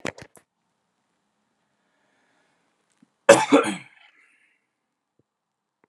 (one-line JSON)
{"cough_length": "5.9 s", "cough_amplitude": 32470, "cough_signal_mean_std_ratio": 0.18, "survey_phase": "alpha (2021-03-01 to 2021-08-12)", "age": "18-44", "gender": "Male", "wearing_mask": "No", "symptom_cough_any": true, "symptom_shortness_of_breath": true, "symptom_change_to_sense_of_smell_or_taste": true, "symptom_onset": "3 days", "smoker_status": "Ex-smoker", "respiratory_condition_asthma": false, "respiratory_condition_other": false, "recruitment_source": "Test and Trace", "submission_delay": "2 days", "covid_test_result": "Positive", "covid_test_method": "RT-qPCR", "covid_ct_value": 23.5, "covid_ct_gene": "ORF1ab gene"}